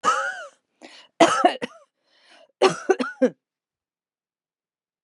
three_cough_length: 5.0 s
three_cough_amplitude: 30038
three_cough_signal_mean_std_ratio: 0.34
survey_phase: beta (2021-08-13 to 2022-03-07)
age: 45-64
gender: Female
wearing_mask: 'No'
symptom_none: true
smoker_status: Never smoked
respiratory_condition_asthma: false
respiratory_condition_other: false
recruitment_source: REACT
submission_delay: 1 day
covid_test_result: Negative
covid_test_method: RT-qPCR
influenza_a_test_result: Negative
influenza_b_test_result: Negative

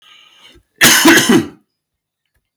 cough_length: 2.6 s
cough_amplitude: 32768
cough_signal_mean_std_ratio: 0.43
survey_phase: beta (2021-08-13 to 2022-03-07)
age: 18-44
gender: Male
wearing_mask: 'No'
symptom_none: true
smoker_status: Never smoked
respiratory_condition_asthma: false
respiratory_condition_other: false
recruitment_source: REACT
submission_delay: 1 day
covid_test_result: Negative
covid_test_method: RT-qPCR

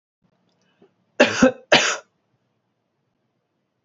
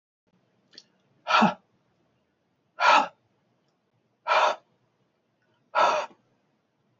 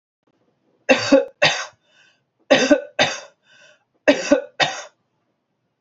cough_length: 3.8 s
cough_amplitude: 28344
cough_signal_mean_std_ratio: 0.26
exhalation_length: 7.0 s
exhalation_amplitude: 16470
exhalation_signal_mean_std_ratio: 0.31
three_cough_length: 5.8 s
three_cough_amplitude: 32727
three_cough_signal_mean_std_ratio: 0.36
survey_phase: alpha (2021-03-01 to 2021-08-12)
age: 45-64
gender: Male
wearing_mask: 'No'
symptom_none: true
symptom_cough_any: true
smoker_status: Never smoked
respiratory_condition_asthma: false
respiratory_condition_other: false
recruitment_source: REACT
submission_delay: 1 day
covid_test_result: Negative
covid_test_method: RT-qPCR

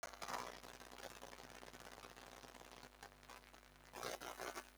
exhalation_length: 4.8 s
exhalation_amplitude: 1148
exhalation_signal_mean_std_ratio: 0.58
survey_phase: beta (2021-08-13 to 2022-03-07)
age: 65+
gender: Female
wearing_mask: 'No'
symptom_runny_or_blocked_nose: true
symptom_sore_throat: true
symptom_headache: true
smoker_status: Never smoked
recruitment_source: Test and Trace
submission_delay: 3 days
covid_test_result: Positive
covid_test_method: RT-qPCR
covid_ct_value: 21.6
covid_ct_gene: ORF1ab gene
covid_ct_mean: 21.9
covid_viral_load: 65000 copies/ml
covid_viral_load_category: Low viral load (10K-1M copies/ml)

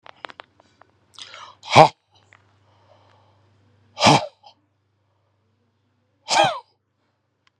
exhalation_length: 7.6 s
exhalation_amplitude: 32768
exhalation_signal_mean_std_ratio: 0.22
survey_phase: beta (2021-08-13 to 2022-03-07)
age: 45-64
gender: Male
wearing_mask: 'No'
symptom_none: true
symptom_onset: 12 days
smoker_status: Ex-smoker
respiratory_condition_asthma: false
respiratory_condition_other: false
recruitment_source: REACT
submission_delay: 1 day
covid_test_result: Negative
covid_test_method: RT-qPCR
influenza_a_test_result: Negative
influenza_b_test_result: Negative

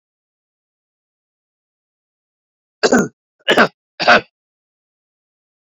cough_length: 5.6 s
cough_amplitude: 31034
cough_signal_mean_std_ratio: 0.24
survey_phase: beta (2021-08-13 to 2022-03-07)
age: 65+
gender: Male
wearing_mask: 'No'
symptom_none: true
smoker_status: Current smoker (e-cigarettes or vapes only)
respiratory_condition_asthma: false
respiratory_condition_other: false
recruitment_source: REACT
submission_delay: 2 days
covid_test_result: Negative
covid_test_method: RT-qPCR
influenza_a_test_result: Unknown/Void
influenza_b_test_result: Unknown/Void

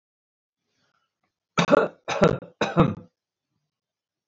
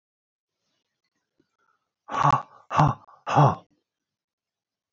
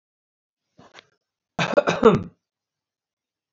three_cough_length: 4.3 s
three_cough_amplitude: 22998
three_cough_signal_mean_std_ratio: 0.31
exhalation_length: 4.9 s
exhalation_amplitude: 17920
exhalation_signal_mean_std_ratio: 0.29
cough_length: 3.5 s
cough_amplitude: 27806
cough_signal_mean_std_ratio: 0.26
survey_phase: beta (2021-08-13 to 2022-03-07)
age: 65+
gender: Male
wearing_mask: 'No'
symptom_none: true
smoker_status: Never smoked
respiratory_condition_asthma: false
respiratory_condition_other: false
recruitment_source: REACT
submission_delay: 2 days
covid_test_result: Negative
covid_test_method: RT-qPCR
influenza_a_test_result: Negative
influenza_b_test_result: Negative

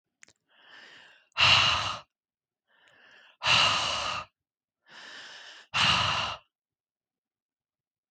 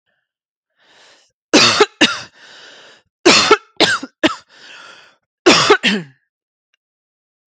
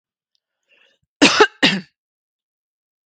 exhalation_length: 8.1 s
exhalation_amplitude: 11994
exhalation_signal_mean_std_ratio: 0.4
three_cough_length: 7.5 s
three_cough_amplitude: 32768
three_cough_signal_mean_std_ratio: 0.36
cough_length: 3.1 s
cough_amplitude: 32768
cough_signal_mean_std_ratio: 0.26
survey_phase: beta (2021-08-13 to 2022-03-07)
age: 18-44
gender: Female
wearing_mask: 'No'
symptom_none: true
smoker_status: Never smoked
respiratory_condition_asthma: false
respiratory_condition_other: false
recruitment_source: REACT
submission_delay: 0 days
covid_test_result: Negative
covid_test_method: RT-qPCR
influenza_a_test_result: Negative
influenza_b_test_result: Negative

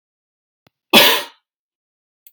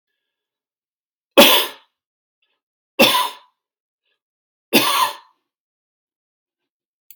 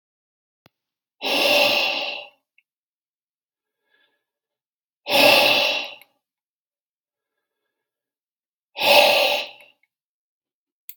cough_length: 2.3 s
cough_amplitude: 32768
cough_signal_mean_std_ratio: 0.27
three_cough_length: 7.2 s
three_cough_amplitude: 32768
three_cough_signal_mean_std_ratio: 0.27
exhalation_length: 11.0 s
exhalation_amplitude: 32768
exhalation_signal_mean_std_ratio: 0.36
survey_phase: beta (2021-08-13 to 2022-03-07)
age: 45-64
gender: Male
wearing_mask: 'No'
symptom_none: true
smoker_status: Ex-smoker
respiratory_condition_asthma: false
respiratory_condition_other: false
recruitment_source: REACT
submission_delay: 2 days
covid_test_result: Negative
covid_test_method: RT-qPCR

